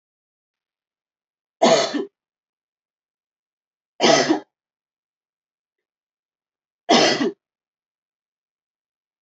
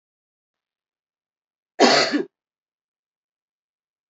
{"three_cough_length": "9.2 s", "three_cough_amplitude": 26281, "three_cough_signal_mean_std_ratio": 0.27, "cough_length": "4.1 s", "cough_amplitude": 28062, "cough_signal_mean_std_ratio": 0.24, "survey_phase": "beta (2021-08-13 to 2022-03-07)", "age": "45-64", "gender": "Female", "wearing_mask": "No", "symptom_none": true, "smoker_status": "Never smoked", "respiratory_condition_asthma": false, "respiratory_condition_other": false, "recruitment_source": "REACT", "submission_delay": "2 days", "covid_test_result": "Negative", "covid_test_method": "RT-qPCR"}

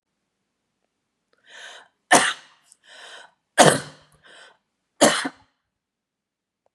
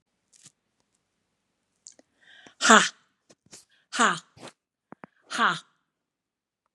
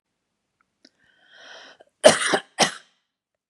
{"three_cough_length": "6.7 s", "three_cough_amplitude": 32768, "three_cough_signal_mean_std_ratio": 0.24, "exhalation_length": "6.7 s", "exhalation_amplitude": 31068, "exhalation_signal_mean_std_ratio": 0.22, "cough_length": "3.5 s", "cough_amplitude": 32768, "cough_signal_mean_std_ratio": 0.24, "survey_phase": "beta (2021-08-13 to 2022-03-07)", "age": "45-64", "gender": "Female", "wearing_mask": "No", "symptom_none": true, "smoker_status": "Ex-smoker", "respiratory_condition_asthma": false, "respiratory_condition_other": false, "recruitment_source": "REACT", "submission_delay": "7 days", "covid_test_result": "Negative", "covid_test_method": "RT-qPCR", "influenza_a_test_result": "Negative", "influenza_b_test_result": "Negative"}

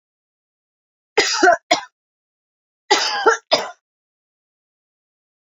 {"cough_length": "5.5 s", "cough_amplitude": 28787, "cough_signal_mean_std_ratio": 0.32, "survey_phase": "beta (2021-08-13 to 2022-03-07)", "age": "45-64", "gender": "Female", "wearing_mask": "No", "symptom_new_continuous_cough": true, "symptom_runny_or_blocked_nose": true, "symptom_shortness_of_breath": true, "symptom_fatigue": true, "symptom_headache": true, "symptom_change_to_sense_of_smell_or_taste": true, "symptom_other": true, "smoker_status": "Ex-smoker", "respiratory_condition_asthma": false, "respiratory_condition_other": false, "recruitment_source": "Test and Trace", "submission_delay": "31 days", "covid_test_result": "Negative", "covid_test_method": "RT-qPCR"}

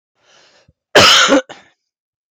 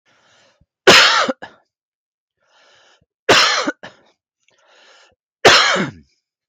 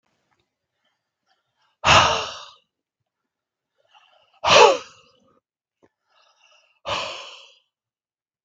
{"cough_length": "2.3 s", "cough_amplitude": 32768, "cough_signal_mean_std_ratio": 0.4, "three_cough_length": "6.5 s", "three_cough_amplitude": 32768, "three_cough_signal_mean_std_ratio": 0.35, "exhalation_length": "8.4 s", "exhalation_amplitude": 32768, "exhalation_signal_mean_std_ratio": 0.25, "survey_phase": "beta (2021-08-13 to 2022-03-07)", "age": "45-64", "gender": "Male", "wearing_mask": "No", "symptom_cough_any": true, "smoker_status": "Ex-smoker", "respiratory_condition_asthma": false, "respiratory_condition_other": false, "recruitment_source": "Test and Trace", "submission_delay": "2 days", "covid_test_result": "Positive", "covid_test_method": "RT-qPCR"}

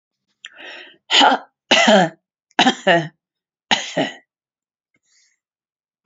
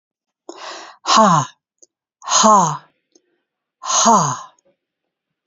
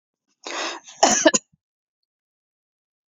{"three_cough_length": "6.1 s", "three_cough_amplitude": 32679, "three_cough_signal_mean_std_ratio": 0.36, "exhalation_length": "5.5 s", "exhalation_amplitude": 30120, "exhalation_signal_mean_std_ratio": 0.42, "cough_length": "3.1 s", "cough_amplitude": 27807, "cough_signal_mean_std_ratio": 0.28, "survey_phase": "alpha (2021-03-01 to 2021-08-12)", "age": "65+", "gender": "Female", "wearing_mask": "No", "symptom_none": true, "smoker_status": "Never smoked", "respiratory_condition_asthma": false, "respiratory_condition_other": false, "recruitment_source": "REACT", "submission_delay": "1 day", "covid_test_result": "Negative", "covid_test_method": "RT-qPCR"}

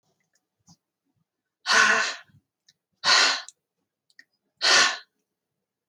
{"exhalation_length": "5.9 s", "exhalation_amplitude": 18740, "exhalation_signal_mean_std_ratio": 0.35, "survey_phase": "alpha (2021-03-01 to 2021-08-12)", "age": "18-44", "gender": "Female", "wearing_mask": "No", "symptom_abdominal_pain": true, "smoker_status": "Never smoked", "respiratory_condition_asthma": false, "respiratory_condition_other": false, "recruitment_source": "REACT", "submission_delay": "2 days", "covid_test_result": "Negative", "covid_test_method": "RT-qPCR"}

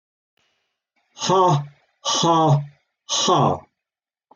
{"exhalation_length": "4.4 s", "exhalation_amplitude": 17696, "exhalation_signal_mean_std_ratio": 0.51, "survey_phase": "alpha (2021-03-01 to 2021-08-12)", "age": "45-64", "gender": "Male", "wearing_mask": "No", "symptom_none": true, "smoker_status": "Ex-smoker", "respiratory_condition_asthma": false, "respiratory_condition_other": false, "recruitment_source": "REACT", "submission_delay": "1 day", "covid_test_result": "Negative", "covid_test_method": "RT-qPCR"}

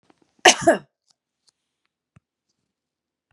{"cough_length": "3.3 s", "cough_amplitude": 32767, "cough_signal_mean_std_ratio": 0.19, "survey_phase": "beta (2021-08-13 to 2022-03-07)", "age": "65+", "gender": "Female", "wearing_mask": "No", "symptom_none": true, "smoker_status": "Ex-smoker", "respiratory_condition_asthma": false, "respiratory_condition_other": false, "recruitment_source": "REACT", "submission_delay": "0 days", "covid_test_result": "Negative", "covid_test_method": "RT-qPCR", "covid_ct_value": 38.0, "covid_ct_gene": "N gene", "influenza_a_test_result": "Negative", "influenza_b_test_result": "Negative"}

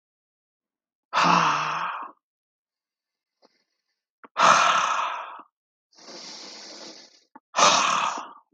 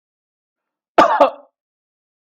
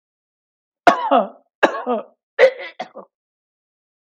{"exhalation_length": "8.5 s", "exhalation_amplitude": 23470, "exhalation_signal_mean_std_ratio": 0.43, "cough_length": "2.2 s", "cough_amplitude": 32768, "cough_signal_mean_std_ratio": 0.28, "three_cough_length": "4.2 s", "three_cough_amplitude": 32766, "three_cough_signal_mean_std_ratio": 0.32, "survey_phase": "beta (2021-08-13 to 2022-03-07)", "age": "45-64", "gender": "Male", "wearing_mask": "No", "symptom_none": true, "smoker_status": "Never smoked", "respiratory_condition_asthma": false, "respiratory_condition_other": false, "recruitment_source": "REACT", "submission_delay": "1 day", "covid_test_result": "Negative", "covid_test_method": "RT-qPCR", "influenza_a_test_result": "Unknown/Void", "influenza_b_test_result": "Unknown/Void"}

